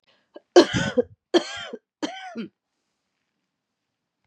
{
  "three_cough_length": "4.3 s",
  "three_cough_amplitude": 29560,
  "three_cough_signal_mean_std_ratio": 0.26,
  "survey_phase": "beta (2021-08-13 to 2022-03-07)",
  "age": "45-64",
  "gender": "Female",
  "wearing_mask": "No",
  "symptom_cough_any": true,
  "symptom_runny_or_blocked_nose": true,
  "symptom_shortness_of_breath": true,
  "symptom_sore_throat": true,
  "symptom_fatigue": true,
  "symptom_headache": true,
  "symptom_onset": "6 days",
  "smoker_status": "Never smoked",
  "respiratory_condition_asthma": false,
  "respiratory_condition_other": false,
  "recruitment_source": "Test and Trace",
  "submission_delay": "1 day",
  "covid_test_result": "Positive",
  "covid_test_method": "RT-qPCR",
  "covid_ct_value": 24.0,
  "covid_ct_gene": "N gene"
}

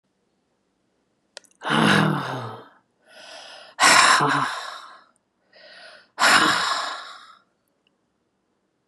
{
  "exhalation_length": "8.9 s",
  "exhalation_amplitude": 27931,
  "exhalation_signal_mean_std_ratio": 0.42,
  "survey_phase": "beta (2021-08-13 to 2022-03-07)",
  "age": "45-64",
  "gender": "Female",
  "wearing_mask": "No",
  "symptom_none": true,
  "smoker_status": "Ex-smoker",
  "respiratory_condition_asthma": false,
  "respiratory_condition_other": false,
  "recruitment_source": "REACT",
  "submission_delay": "3 days",
  "covid_test_result": "Negative",
  "covid_test_method": "RT-qPCR",
  "influenza_a_test_result": "Negative",
  "influenza_b_test_result": "Negative"
}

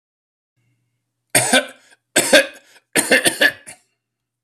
{
  "cough_length": "4.4 s",
  "cough_amplitude": 32767,
  "cough_signal_mean_std_ratio": 0.36,
  "survey_phase": "alpha (2021-03-01 to 2021-08-12)",
  "age": "65+",
  "gender": "Male",
  "wearing_mask": "No",
  "symptom_none": true,
  "smoker_status": "Ex-smoker",
  "respiratory_condition_asthma": false,
  "respiratory_condition_other": false,
  "recruitment_source": "REACT",
  "submission_delay": "2 days",
  "covid_test_result": "Negative",
  "covid_test_method": "RT-qPCR"
}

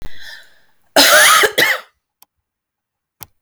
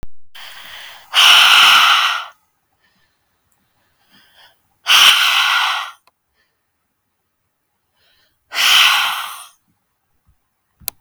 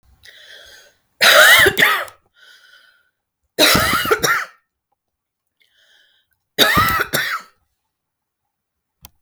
{
  "cough_length": "3.4 s",
  "cough_amplitude": 32768,
  "cough_signal_mean_std_ratio": 0.44,
  "exhalation_length": "11.0 s",
  "exhalation_amplitude": 32766,
  "exhalation_signal_mean_std_ratio": 0.43,
  "three_cough_length": "9.2 s",
  "three_cough_amplitude": 32768,
  "three_cough_signal_mean_std_ratio": 0.39,
  "survey_phase": "beta (2021-08-13 to 2022-03-07)",
  "age": "18-44",
  "gender": "Female",
  "wearing_mask": "No",
  "symptom_none": true,
  "symptom_onset": "12 days",
  "smoker_status": "Ex-smoker",
  "respiratory_condition_asthma": false,
  "respiratory_condition_other": false,
  "recruitment_source": "REACT",
  "submission_delay": "2 days",
  "covid_test_result": "Negative",
  "covid_test_method": "RT-qPCR",
  "influenza_a_test_result": "Negative",
  "influenza_b_test_result": "Negative"
}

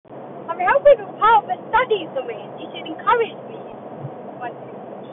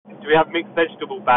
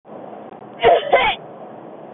{
  "three_cough_length": "5.1 s",
  "three_cough_amplitude": 23700,
  "three_cough_signal_mean_std_ratio": 0.54,
  "exhalation_length": "1.4 s",
  "exhalation_amplitude": 19520,
  "exhalation_signal_mean_std_ratio": 0.58,
  "cough_length": "2.1 s",
  "cough_amplitude": 24153,
  "cough_signal_mean_std_ratio": 0.49,
  "survey_phase": "beta (2021-08-13 to 2022-03-07)",
  "age": "18-44",
  "gender": "Female",
  "wearing_mask": "No",
  "symptom_none": true,
  "smoker_status": "Never smoked",
  "respiratory_condition_asthma": false,
  "respiratory_condition_other": false,
  "recruitment_source": "REACT",
  "submission_delay": "3 days",
  "covid_test_result": "Negative",
  "covid_test_method": "RT-qPCR",
  "influenza_a_test_result": "Negative",
  "influenza_b_test_result": "Negative"
}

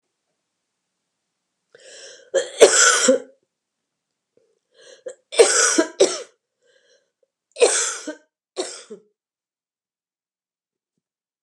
{
  "three_cough_length": "11.4 s",
  "three_cough_amplitude": 32768,
  "three_cough_signal_mean_std_ratio": 0.3,
  "survey_phase": "beta (2021-08-13 to 2022-03-07)",
  "age": "45-64",
  "gender": "Female",
  "wearing_mask": "No",
  "symptom_cough_any": true,
  "symptom_fatigue": true,
  "symptom_headache": true,
  "symptom_onset": "4 days",
  "smoker_status": "Prefer not to say",
  "respiratory_condition_asthma": false,
  "respiratory_condition_other": false,
  "recruitment_source": "Test and Trace",
  "submission_delay": "2 days",
  "covid_test_result": "Positive",
  "covid_test_method": "RT-qPCR",
  "covid_ct_value": 18.0,
  "covid_ct_gene": "ORF1ab gene",
  "covid_ct_mean": 18.2,
  "covid_viral_load": "1100000 copies/ml",
  "covid_viral_load_category": "High viral load (>1M copies/ml)"
}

